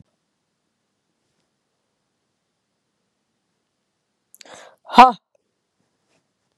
exhalation_length: 6.6 s
exhalation_amplitude: 32768
exhalation_signal_mean_std_ratio: 0.12
survey_phase: beta (2021-08-13 to 2022-03-07)
age: 18-44
gender: Female
wearing_mask: 'No'
symptom_cough_any: true
symptom_runny_or_blocked_nose: true
symptom_sore_throat: true
symptom_headache: true
symptom_onset: 3 days
smoker_status: Never smoked
respiratory_condition_asthma: false
respiratory_condition_other: false
recruitment_source: Test and Trace
submission_delay: 2 days
covid_test_result: Positive
covid_test_method: RT-qPCR
covid_ct_value: 24.1
covid_ct_gene: ORF1ab gene
covid_ct_mean: 24.4
covid_viral_load: 10000 copies/ml
covid_viral_load_category: Low viral load (10K-1M copies/ml)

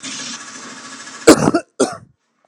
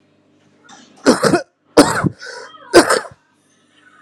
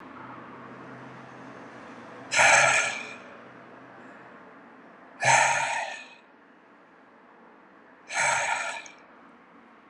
cough_length: 2.5 s
cough_amplitude: 32768
cough_signal_mean_std_ratio: 0.36
three_cough_length: 4.0 s
three_cough_amplitude: 32768
three_cough_signal_mean_std_ratio: 0.36
exhalation_length: 9.9 s
exhalation_amplitude: 17051
exhalation_signal_mean_std_ratio: 0.42
survey_phase: beta (2021-08-13 to 2022-03-07)
age: 18-44
gender: Male
wearing_mask: 'Yes'
symptom_runny_or_blocked_nose: true
symptom_change_to_sense_of_smell_or_taste: true
symptom_loss_of_taste: true
smoker_status: Current smoker (1 to 10 cigarettes per day)
respiratory_condition_asthma: false
respiratory_condition_other: false
recruitment_source: Test and Trace
submission_delay: 2 days
covid_test_result: Positive
covid_test_method: RT-qPCR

